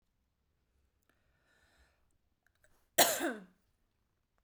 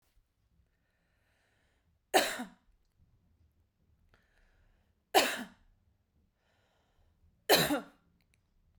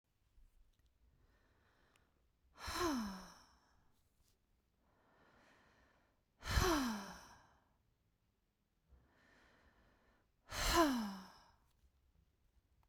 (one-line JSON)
{"cough_length": "4.4 s", "cough_amplitude": 10332, "cough_signal_mean_std_ratio": 0.2, "three_cough_length": "8.8 s", "three_cough_amplitude": 10887, "three_cough_signal_mean_std_ratio": 0.23, "exhalation_length": "12.9 s", "exhalation_amplitude": 3039, "exhalation_signal_mean_std_ratio": 0.31, "survey_phase": "beta (2021-08-13 to 2022-03-07)", "age": "45-64", "gender": "Female", "wearing_mask": "No", "symptom_none": true, "smoker_status": "Never smoked", "respiratory_condition_asthma": false, "respiratory_condition_other": false, "recruitment_source": "REACT", "submission_delay": "2 days", "covid_test_result": "Negative", "covid_test_method": "RT-qPCR"}